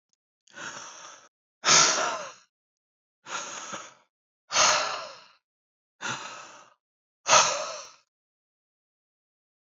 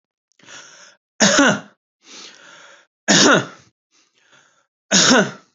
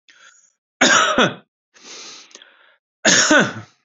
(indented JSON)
{
  "exhalation_length": "9.6 s",
  "exhalation_amplitude": 19713,
  "exhalation_signal_mean_std_ratio": 0.34,
  "three_cough_length": "5.5 s",
  "three_cough_amplitude": 32768,
  "three_cough_signal_mean_std_ratio": 0.38,
  "cough_length": "3.8 s",
  "cough_amplitude": 32768,
  "cough_signal_mean_std_ratio": 0.42,
  "survey_phase": "beta (2021-08-13 to 2022-03-07)",
  "age": "18-44",
  "gender": "Male",
  "wearing_mask": "Yes",
  "symptom_abdominal_pain": true,
  "symptom_headache": true,
  "symptom_onset": "7 days",
  "smoker_status": "Ex-smoker",
  "respiratory_condition_asthma": false,
  "respiratory_condition_other": false,
  "recruitment_source": "REACT",
  "submission_delay": "1 day",
  "covid_test_result": "Negative",
  "covid_test_method": "RT-qPCR",
  "influenza_a_test_result": "Unknown/Void",
  "influenza_b_test_result": "Unknown/Void"
}